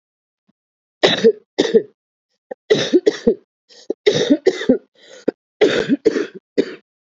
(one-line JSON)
{"three_cough_length": "7.1 s", "three_cough_amplitude": 32767, "three_cough_signal_mean_std_ratio": 0.41, "survey_phase": "beta (2021-08-13 to 2022-03-07)", "age": "18-44", "gender": "Female", "wearing_mask": "No", "symptom_cough_any": true, "symptom_runny_or_blocked_nose": true, "symptom_sore_throat": true, "symptom_headache": true, "symptom_onset": "13 days", "smoker_status": "Current smoker (11 or more cigarettes per day)", "respiratory_condition_asthma": false, "respiratory_condition_other": true, "recruitment_source": "REACT", "submission_delay": "1 day", "covid_test_result": "Negative", "covid_test_method": "RT-qPCR", "influenza_a_test_result": "Unknown/Void", "influenza_b_test_result": "Unknown/Void"}